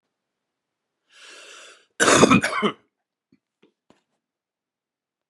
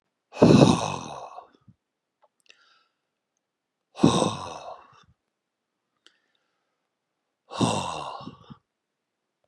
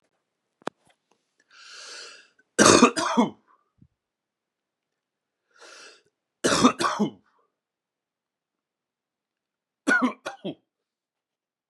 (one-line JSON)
{"cough_length": "5.3 s", "cough_amplitude": 30582, "cough_signal_mean_std_ratio": 0.26, "exhalation_length": "9.5 s", "exhalation_amplitude": 28323, "exhalation_signal_mean_std_ratio": 0.27, "three_cough_length": "11.7 s", "three_cough_amplitude": 30063, "three_cough_signal_mean_std_ratio": 0.27, "survey_phase": "beta (2021-08-13 to 2022-03-07)", "age": "45-64", "gender": "Male", "wearing_mask": "No", "symptom_cough_any": true, "symptom_runny_or_blocked_nose": true, "symptom_sore_throat": true, "symptom_fatigue": true, "symptom_onset": "4 days", "smoker_status": "Ex-smoker", "respiratory_condition_asthma": false, "respiratory_condition_other": false, "recruitment_source": "Test and Trace", "submission_delay": "2 days", "covid_test_result": "Positive", "covid_test_method": "RT-qPCR", "covid_ct_value": 11.1, "covid_ct_gene": "ORF1ab gene"}